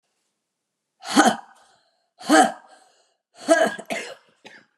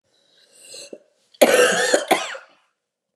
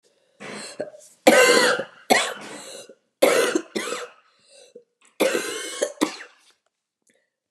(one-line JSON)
{"exhalation_length": "4.8 s", "exhalation_amplitude": 32032, "exhalation_signal_mean_std_ratio": 0.33, "cough_length": "3.2 s", "cough_amplitude": 31568, "cough_signal_mean_std_ratio": 0.4, "three_cough_length": "7.5 s", "three_cough_amplitude": 31238, "three_cough_signal_mean_std_ratio": 0.41, "survey_phase": "beta (2021-08-13 to 2022-03-07)", "age": "45-64", "gender": "Female", "wearing_mask": "No", "symptom_cough_any": true, "symptom_new_continuous_cough": true, "symptom_runny_or_blocked_nose": true, "symptom_shortness_of_breath": true, "symptom_sore_throat": true, "symptom_fatigue": true, "symptom_fever_high_temperature": true, "symptom_headache": true, "symptom_change_to_sense_of_smell_or_taste": true, "symptom_loss_of_taste": true, "symptom_onset": "3 days", "smoker_status": "Never smoked", "respiratory_condition_asthma": true, "respiratory_condition_other": false, "recruitment_source": "Test and Trace", "submission_delay": "1 day", "covid_test_result": "Positive", "covid_test_method": "ePCR"}